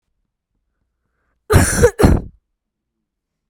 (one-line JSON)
{"cough_length": "3.5 s", "cough_amplitude": 32768, "cough_signal_mean_std_ratio": 0.33, "survey_phase": "beta (2021-08-13 to 2022-03-07)", "age": "18-44", "gender": "Female", "wearing_mask": "No", "symptom_cough_any": true, "symptom_new_continuous_cough": true, "symptom_runny_or_blocked_nose": true, "symptom_shortness_of_breath": true, "symptom_sore_throat": true, "symptom_fatigue": true, "symptom_headache": true, "symptom_other": true, "symptom_onset": "5 days", "smoker_status": "Never smoked", "respiratory_condition_asthma": false, "respiratory_condition_other": false, "recruitment_source": "Test and Trace", "submission_delay": "2 days", "covid_test_result": "Positive", "covid_test_method": "RT-qPCR", "covid_ct_value": 28.9, "covid_ct_gene": "N gene", "covid_ct_mean": 29.2, "covid_viral_load": "270 copies/ml", "covid_viral_load_category": "Minimal viral load (< 10K copies/ml)"}